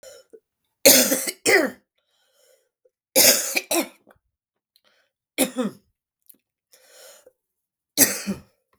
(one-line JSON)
{"three_cough_length": "8.8 s", "three_cough_amplitude": 32768, "three_cough_signal_mean_std_ratio": 0.32, "survey_phase": "beta (2021-08-13 to 2022-03-07)", "age": "45-64", "gender": "Female", "wearing_mask": "No", "symptom_cough_any": true, "symptom_onset": "8 days", "smoker_status": "Never smoked", "respiratory_condition_asthma": false, "respiratory_condition_other": false, "recruitment_source": "REACT", "submission_delay": "1 day", "covid_test_result": "Negative", "covid_test_method": "RT-qPCR", "influenza_a_test_result": "Negative", "influenza_b_test_result": "Negative"}